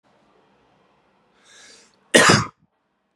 {"cough_length": "3.2 s", "cough_amplitude": 32767, "cough_signal_mean_std_ratio": 0.25, "survey_phase": "beta (2021-08-13 to 2022-03-07)", "age": "18-44", "gender": "Male", "wearing_mask": "No", "symptom_change_to_sense_of_smell_or_taste": true, "symptom_loss_of_taste": true, "symptom_onset": "2 days", "smoker_status": "Ex-smoker", "respiratory_condition_asthma": false, "respiratory_condition_other": false, "recruitment_source": "Test and Trace", "submission_delay": "2 days", "covid_test_result": "Positive", "covid_test_method": "ePCR"}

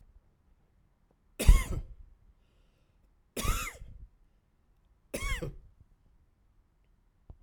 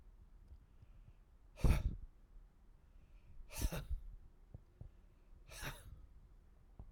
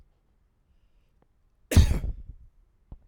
{"three_cough_length": "7.4 s", "three_cough_amplitude": 14677, "three_cough_signal_mean_std_ratio": 0.23, "exhalation_length": "6.9 s", "exhalation_amplitude": 3436, "exhalation_signal_mean_std_ratio": 0.36, "cough_length": "3.1 s", "cough_amplitude": 16714, "cough_signal_mean_std_ratio": 0.26, "survey_phase": "alpha (2021-03-01 to 2021-08-12)", "age": "45-64", "gender": "Male", "wearing_mask": "No", "symptom_none": true, "smoker_status": "Never smoked", "respiratory_condition_asthma": false, "respiratory_condition_other": false, "recruitment_source": "REACT", "submission_delay": "3 days", "covid_test_result": "Negative", "covid_test_method": "RT-qPCR"}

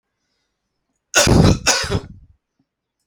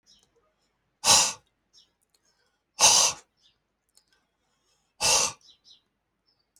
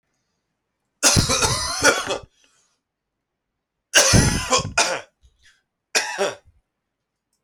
{"cough_length": "3.1 s", "cough_amplitude": 32767, "cough_signal_mean_std_ratio": 0.39, "exhalation_length": "6.6 s", "exhalation_amplitude": 20797, "exhalation_signal_mean_std_ratio": 0.29, "three_cough_length": "7.4 s", "three_cough_amplitude": 30883, "three_cough_signal_mean_std_ratio": 0.42, "survey_phase": "alpha (2021-03-01 to 2021-08-12)", "age": "18-44", "gender": "Male", "wearing_mask": "No", "symptom_cough_any": true, "symptom_shortness_of_breath": true, "symptom_fatigue": true, "symptom_onset": "7 days", "smoker_status": "Ex-smoker", "respiratory_condition_asthma": true, "respiratory_condition_other": false, "recruitment_source": "Test and Trace", "submission_delay": "2 days", "covid_test_result": "Positive", "covid_test_method": "RT-qPCR", "covid_ct_value": 14.0, "covid_ct_gene": "S gene", "covid_ct_mean": 14.5, "covid_viral_load": "17000000 copies/ml", "covid_viral_load_category": "High viral load (>1M copies/ml)"}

